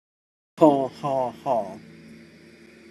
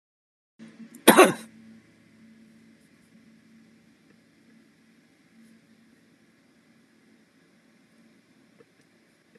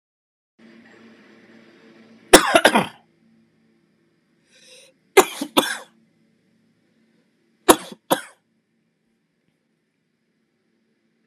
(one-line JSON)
{"exhalation_length": "2.9 s", "exhalation_amplitude": 25292, "exhalation_signal_mean_std_ratio": 0.39, "cough_length": "9.4 s", "cough_amplitude": 32459, "cough_signal_mean_std_ratio": 0.15, "three_cough_length": "11.3 s", "three_cough_amplitude": 32768, "three_cough_signal_mean_std_ratio": 0.19, "survey_phase": "alpha (2021-03-01 to 2021-08-12)", "age": "45-64", "gender": "Male", "wearing_mask": "No", "symptom_none": true, "smoker_status": "Ex-smoker", "respiratory_condition_asthma": false, "respiratory_condition_other": false, "recruitment_source": "REACT", "submission_delay": "2 days", "covid_test_result": "Negative", "covid_test_method": "RT-qPCR"}